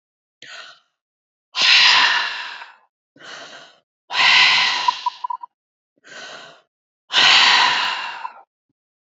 {"exhalation_length": "9.1 s", "exhalation_amplitude": 29876, "exhalation_signal_mean_std_ratio": 0.46, "survey_phase": "beta (2021-08-13 to 2022-03-07)", "age": "65+", "gender": "Female", "wearing_mask": "No", "symptom_none": true, "smoker_status": "Never smoked", "respiratory_condition_asthma": true, "respiratory_condition_other": false, "recruitment_source": "REACT", "submission_delay": "1 day", "covid_test_result": "Negative", "covid_test_method": "RT-qPCR", "influenza_a_test_result": "Negative", "influenza_b_test_result": "Negative"}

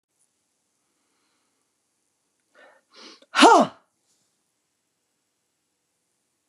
{"exhalation_length": "6.5 s", "exhalation_amplitude": 32300, "exhalation_signal_mean_std_ratio": 0.17, "survey_phase": "beta (2021-08-13 to 2022-03-07)", "age": "65+", "gender": "Female", "wearing_mask": "No", "symptom_cough_any": true, "smoker_status": "Current smoker (11 or more cigarettes per day)", "respiratory_condition_asthma": false, "respiratory_condition_other": false, "recruitment_source": "REACT", "submission_delay": "1 day", "covid_test_result": "Negative", "covid_test_method": "RT-qPCR", "influenza_a_test_result": "Negative", "influenza_b_test_result": "Negative"}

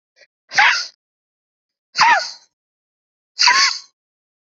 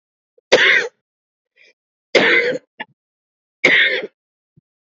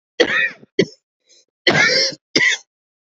{"exhalation_length": "4.5 s", "exhalation_amplitude": 32155, "exhalation_signal_mean_std_ratio": 0.37, "three_cough_length": "4.9 s", "three_cough_amplitude": 29622, "three_cough_signal_mean_std_ratio": 0.4, "cough_length": "3.1 s", "cough_amplitude": 29554, "cough_signal_mean_std_ratio": 0.48, "survey_phase": "beta (2021-08-13 to 2022-03-07)", "age": "45-64", "gender": "Female", "wearing_mask": "No", "symptom_none": true, "smoker_status": "Never smoked", "respiratory_condition_asthma": true, "respiratory_condition_other": false, "recruitment_source": "REACT", "submission_delay": "1 day", "covid_test_result": "Negative", "covid_test_method": "RT-qPCR", "influenza_a_test_result": "Negative", "influenza_b_test_result": "Negative"}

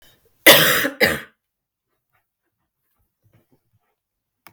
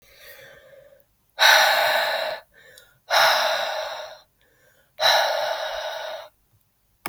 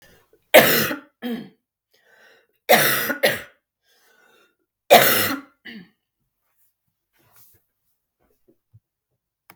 {"cough_length": "4.5 s", "cough_amplitude": 32768, "cough_signal_mean_std_ratio": 0.26, "exhalation_length": "7.1 s", "exhalation_amplitude": 25890, "exhalation_signal_mean_std_ratio": 0.52, "three_cough_length": "9.6 s", "three_cough_amplitude": 32768, "three_cough_signal_mean_std_ratio": 0.29, "survey_phase": "beta (2021-08-13 to 2022-03-07)", "age": "45-64", "gender": "Female", "wearing_mask": "No", "symptom_cough_any": true, "symptom_runny_or_blocked_nose": true, "symptom_abdominal_pain": true, "symptom_fatigue": true, "symptom_fever_high_temperature": true, "symptom_headache": true, "symptom_change_to_sense_of_smell_or_taste": true, "symptom_onset": "4 days", "smoker_status": "Never smoked", "respiratory_condition_asthma": false, "respiratory_condition_other": false, "recruitment_source": "Test and Trace", "submission_delay": "1 day", "covid_test_result": "Positive", "covid_test_method": "RT-qPCR", "covid_ct_value": 14.5, "covid_ct_gene": "N gene", "covid_ct_mean": 14.8, "covid_viral_load": "14000000 copies/ml", "covid_viral_load_category": "High viral load (>1M copies/ml)"}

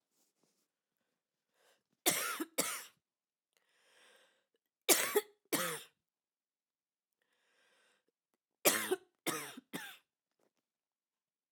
{"three_cough_length": "11.5 s", "three_cough_amplitude": 9179, "three_cough_signal_mean_std_ratio": 0.27, "survey_phase": "beta (2021-08-13 to 2022-03-07)", "age": "18-44", "gender": "Female", "wearing_mask": "No", "symptom_cough_any": true, "symptom_runny_or_blocked_nose": true, "symptom_onset": "3 days", "smoker_status": "Never smoked", "respiratory_condition_asthma": false, "respiratory_condition_other": false, "recruitment_source": "Test and Trace", "submission_delay": "1 day", "covid_test_result": "Positive", "covid_test_method": "RT-qPCR", "covid_ct_value": 18.1, "covid_ct_gene": "ORF1ab gene", "covid_ct_mean": 18.5, "covid_viral_load": "840000 copies/ml", "covid_viral_load_category": "Low viral load (10K-1M copies/ml)"}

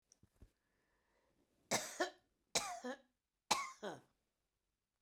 {"three_cough_length": "5.0 s", "three_cough_amplitude": 4085, "three_cough_signal_mean_std_ratio": 0.31, "survey_phase": "beta (2021-08-13 to 2022-03-07)", "age": "65+", "gender": "Female", "wearing_mask": "No", "symptom_none": true, "smoker_status": "Ex-smoker", "respiratory_condition_asthma": false, "respiratory_condition_other": false, "recruitment_source": "REACT", "submission_delay": "1 day", "covid_test_result": "Negative", "covid_test_method": "RT-qPCR", "influenza_a_test_result": "Negative", "influenza_b_test_result": "Negative"}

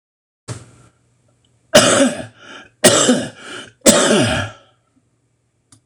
{"three_cough_length": "5.9 s", "three_cough_amplitude": 26028, "three_cough_signal_mean_std_ratio": 0.42, "survey_phase": "beta (2021-08-13 to 2022-03-07)", "age": "65+", "gender": "Male", "wearing_mask": "No", "symptom_cough_any": true, "symptom_runny_or_blocked_nose": true, "symptom_abdominal_pain": true, "symptom_fatigue": true, "symptom_headache": true, "symptom_onset": "4 days", "smoker_status": "Ex-smoker", "respiratory_condition_asthma": false, "respiratory_condition_other": false, "recruitment_source": "Test and Trace", "submission_delay": "1 day", "covid_test_result": "Positive", "covid_test_method": "RT-qPCR", "covid_ct_value": 18.2, "covid_ct_gene": "ORF1ab gene"}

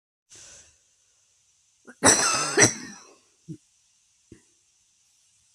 {"cough_length": "5.5 s", "cough_amplitude": 27164, "cough_signal_mean_std_ratio": 0.27, "survey_phase": "beta (2021-08-13 to 2022-03-07)", "age": "45-64", "gender": "Female", "wearing_mask": "No", "symptom_none": true, "smoker_status": "Current smoker (1 to 10 cigarettes per day)", "respiratory_condition_asthma": false, "respiratory_condition_other": false, "recruitment_source": "REACT", "submission_delay": "0 days", "covid_test_result": "Negative", "covid_test_method": "RT-qPCR", "influenza_a_test_result": "Negative", "influenza_b_test_result": "Negative"}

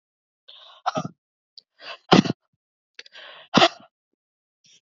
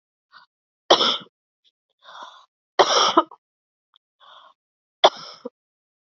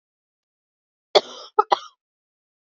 {"exhalation_length": "4.9 s", "exhalation_amplitude": 28023, "exhalation_signal_mean_std_ratio": 0.22, "three_cough_length": "6.1 s", "three_cough_amplitude": 31646, "three_cough_signal_mean_std_ratio": 0.26, "cough_length": "2.6 s", "cough_amplitude": 27780, "cough_signal_mean_std_ratio": 0.17, "survey_phase": "beta (2021-08-13 to 2022-03-07)", "age": "18-44", "gender": "Female", "wearing_mask": "No", "symptom_cough_any": true, "symptom_runny_or_blocked_nose": true, "symptom_sore_throat": true, "symptom_fatigue": true, "symptom_headache": true, "smoker_status": "Ex-smoker", "respiratory_condition_asthma": false, "respiratory_condition_other": false, "recruitment_source": "Test and Trace", "submission_delay": "2 days", "covid_test_result": "Positive", "covid_test_method": "ePCR"}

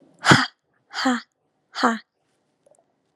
{"exhalation_length": "3.2 s", "exhalation_amplitude": 32413, "exhalation_signal_mean_std_ratio": 0.31, "survey_phase": "alpha (2021-03-01 to 2021-08-12)", "age": "18-44", "gender": "Female", "wearing_mask": "No", "symptom_none": true, "smoker_status": "Never smoked", "respiratory_condition_asthma": true, "respiratory_condition_other": false, "recruitment_source": "Test and Trace", "submission_delay": "0 days", "covid_test_result": "Negative", "covid_test_method": "LFT"}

